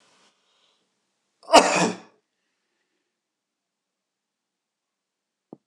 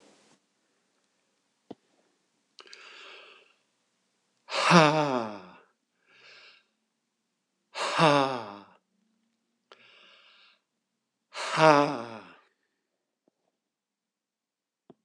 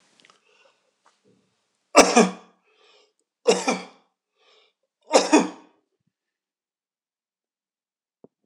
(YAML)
cough_length: 5.7 s
cough_amplitude: 26028
cough_signal_mean_std_ratio: 0.18
exhalation_length: 15.0 s
exhalation_amplitude: 21765
exhalation_signal_mean_std_ratio: 0.25
three_cough_length: 8.5 s
three_cough_amplitude: 26028
three_cough_signal_mean_std_ratio: 0.23
survey_phase: alpha (2021-03-01 to 2021-08-12)
age: 65+
gender: Male
wearing_mask: 'No'
symptom_none: true
smoker_status: Ex-smoker
respiratory_condition_asthma: false
respiratory_condition_other: false
recruitment_source: REACT
submission_delay: 1 day
covid_test_result: Negative
covid_test_method: RT-qPCR